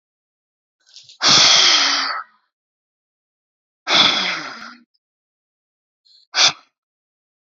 {"exhalation_length": "7.5 s", "exhalation_amplitude": 32767, "exhalation_signal_mean_std_ratio": 0.38, "survey_phase": "beta (2021-08-13 to 2022-03-07)", "age": "18-44", "gender": "Female", "wearing_mask": "No", "symptom_cough_any": true, "symptom_new_continuous_cough": true, "symptom_sore_throat": true, "symptom_other": true, "symptom_onset": "3 days", "smoker_status": "Ex-smoker", "respiratory_condition_asthma": false, "respiratory_condition_other": false, "recruitment_source": "Test and Trace", "submission_delay": "1 day", "covid_test_result": "Negative", "covid_test_method": "RT-qPCR"}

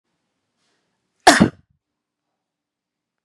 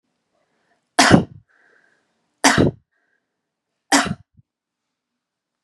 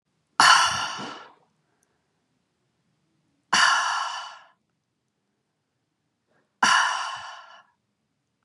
{"cough_length": "3.2 s", "cough_amplitude": 32768, "cough_signal_mean_std_ratio": 0.18, "three_cough_length": "5.6 s", "three_cough_amplitude": 32768, "three_cough_signal_mean_std_ratio": 0.27, "exhalation_length": "8.4 s", "exhalation_amplitude": 26564, "exhalation_signal_mean_std_ratio": 0.34, "survey_phase": "beta (2021-08-13 to 2022-03-07)", "age": "18-44", "gender": "Female", "wearing_mask": "Prefer not to say", "symptom_none": true, "smoker_status": "Never smoked", "respiratory_condition_asthma": false, "respiratory_condition_other": false, "recruitment_source": "REACT", "submission_delay": "1 day", "covid_test_result": "Negative", "covid_test_method": "RT-qPCR", "influenza_a_test_result": "Unknown/Void", "influenza_b_test_result": "Unknown/Void"}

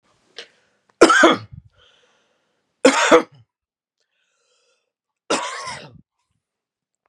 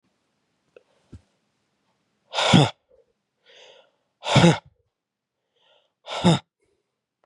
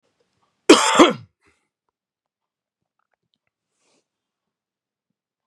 {"three_cough_length": "7.1 s", "three_cough_amplitude": 32768, "three_cough_signal_mean_std_ratio": 0.28, "exhalation_length": "7.3 s", "exhalation_amplitude": 26591, "exhalation_signal_mean_std_ratio": 0.26, "cough_length": "5.5 s", "cough_amplitude": 32768, "cough_signal_mean_std_ratio": 0.19, "survey_phase": "beta (2021-08-13 to 2022-03-07)", "age": "18-44", "gender": "Male", "wearing_mask": "No", "symptom_cough_any": true, "symptom_runny_or_blocked_nose": true, "symptom_shortness_of_breath": true, "symptom_sore_throat": true, "symptom_fatigue": true, "symptom_headache": true, "symptom_onset": "4 days", "smoker_status": "Never smoked", "respiratory_condition_asthma": false, "respiratory_condition_other": false, "recruitment_source": "Test and Trace", "submission_delay": "2 days", "covid_test_result": "Positive", "covid_test_method": "RT-qPCR", "covid_ct_value": 16.9, "covid_ct_gene": "ORF1ab gene"}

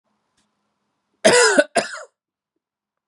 {"cough_length": "3.1 s", "cough_amplitude": 31806, "cough_signal_mean_std_ratio": 0.32, "survey_phase": "beta (2021-08-13 to 2022-03-07)", "age": "18-44", "gender": "Male", "wearing_mask": "No", "symptom_cough_any": true, "symptom_sore_throat": true, "symptom_onset": "4 days", "smoker_status": "Never smoked", "respiratory_condition_asthma": false, "respiratory_condition_other": false, "recruitment_source": "Test and Trace", "submission_delay": "1 day", "covid_test_result": "Positive", "covid_test_method": "RT-qPCR", "covid_ct_value": 20.8, "covid_ct_gene": "N gene"}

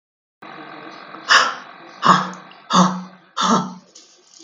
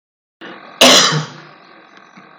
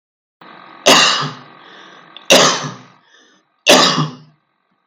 {"exhalation_length": "4.4 s", "exhalation_amplitude": 32768, "exhalation_signal_mean_std_ratio": 0.43, "cough_length": "2.4 s", "cough_amplitude": 32768, "cough_signal_mean_std_ratio": 0.38, "three_cough_length": "4.9 s", "three_cough_amplitude": 32768, "three_cough_signal_mean_std_ratio": 0.41, "survey_phase": "beta (2021-08-13 to 2022-03-07)", "age": "65+", "gender": "Female", "wearing_mask": "No", "symptom_change_to_sense_of_smell_or_taste": true, "symptom_loss_of_taste": true, "smoker_status": "Ex-smoker", "respiratory_condition_asthma": false, "respiratory_condition_other": false, "recruitment_source": "REACT", "submission_delay": "1 day", "covid_test_result": "Negative", "covid_test_method": "RT-qPCR", "influenza_a_test_result": "Negative", "influenza_b_test_result": "Negative"}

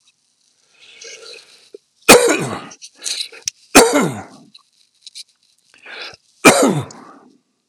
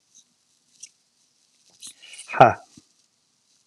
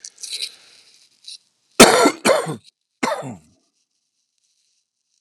{"three_cough_length": "7.7 s", "three_cough_amplitude": 32768, "three_cough_signal_mean_std_ratio": 0.32, "exhalation_length": "3.7 s", "exhalation_amplitude": 32768, "exhalation_signal_mean_std_ratio": 0.16, "cough_length": "5.2 s", "cough_amplitude": 32768, "cough_signal_mean_std_ratio": 0.29, "survey_phase": "alpha (2021-03-01 to 2021-08-12)", "age": "45-64", "gender": "Male", "wearing_mask": "No", "symptom_cough_any": true, "symptom_new_continuous_cough": true, "symptom_fatigue": true, "symptom_onset": "5 days", "smoker_status": "Never smoked", "respiratory_condition_asthma": false, "respiratory_condition_other": false, "recruitment_source": "Test and Trace", "submission_delay": "2 days", "covid_test_result": "Positive", "covid_test_method": "RT-qPCR"}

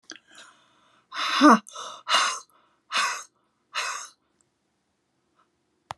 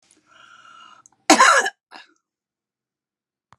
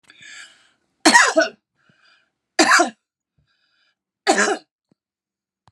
{"exhalation_length": "6.0 s", "exhalation_amplitude": 20743, "exhalation_signal_mean_std_ratio": 0.31, "cough_length": "3.6 s", "cough_amplitude": 32641, "cough_signal_mean_std_ratio": 0.26, "three_cough_length": "5.7 s", "three_cough_amplitude": 32768, "three_cough_signal_mean_std_ratio": 0.32, "survey_phase": "beta (2021-08-13 to 2022-03-07)", "age": "65+", "gender": "Female", "wearing_mask": "No", "symptom_none": true, "smoker_status": "Never smoked", "respiratory_condition_asthma": false, "respiratory_condition_other": false, "recruitment_source": "REACT", "submission_delay": "2 days", "covid_test_result": "Negative", "covid_test_method": "RT-qPCR", "influenza_a_test_result": "Unknown/Void", "influenza_b_test_result": "Unknown/Void"}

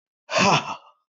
{"exhalation_length": "1.1 s", "exhalation_amplitude": 16512, "exhalation_signal_mean_std_ratio": 0.48, "survey_phase": "beta (2021-08-13 to 2022-03-07)", "age": "45-64", "gender": "Male", "wearing_mask": "No", "symptom_none": true, "smoker_status": "Current smoker (1 to 10 cigarettes per day)", "respiratory_condition_asthma": false, "respiratory_condition_other": false, "recruitment_source": "REACT", "submission_delay": "1 day", "covid_test_result": "Negative", "covid_test_method": "RT-qPCR", "influenza_a_test_result": "Negative", "influenza_b_test_result": "Negative"}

